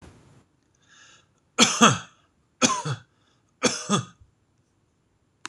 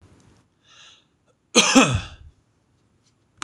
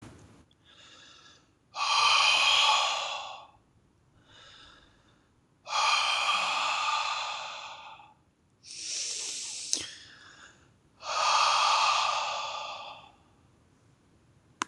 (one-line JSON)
{"three_cough_length": "5.5 s", "three_cough_amplitude": 26027, "three_cough_signal_mean_std_ratio": 0.3, "cough_length": "3.4 s", "cough_amplitude": 26027, "cough_signal_mean_std_ratio": 0.28, "exhalation_length": "14.7 s", "exhalation_amplitude": 20363, "exhalation_signal_mean_std_ratio": 0.55, "survey_phase": "beta (2021-08-13 to 2022-03-07)", "age": "18-44", "gender": "Male", "wearing_mask": "No", "symptom_none": true, "smoker_status": "Never smoked", "respiratory_condition_asthma": false, "respiratory_condition_other": false, "recruitment_source": "REACT", "submission_delay": "3 days", "covid_test_result": "Negative", "covid_test_method": "RT-qPCR", "influenza_a_test_result": "Negative", "influenza_b_test_result": "Negative"}